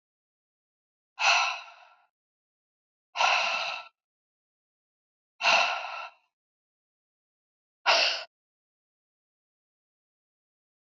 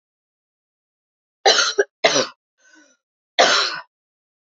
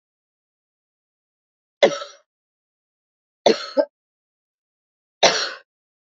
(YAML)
exhalation_length: 10.8 s
exhalation_amplitude: 12477
exhalation_signal_mean_std_ratio: 0.32
cough_length: 4.5 s
cough_amplitude: 29458
cough_signal_mean_std_ratio: 0.34
three_cough_length: 6.1 s
three_cough_amplitude: 29891
three_cough_signal_mean_std_ratio: 0.23
survey_phase: beta (2021-08-13 to 2022-03-07)
age: 45-64
gender: Female
wearing_mask: 'No'
symptom_cough_any: true
symptom_runny_or_blocked_nose: true
symptom_shortness_of_breath: true
symptom_sore_throat: true
symptom_fatigue: true
symptom_fever_high_temperature: true
symptom_headache: true
smoker_status: Never smoked
respiratory_condition_asthma: false
respiratory_condition_other: false
recruitment_source: Test and Trace
submission_delay: 2 days
covid_test_result: Positive
covid_test_method: RT-qPCR
covid_ct_value: 14.8
covid_ct_gene: ORF1ab gene
covid_ct_mean: 15.2
covid_viral_load: 10000000 copies/ml
covid_viral_load_category: High viral load (>1M copies/ml)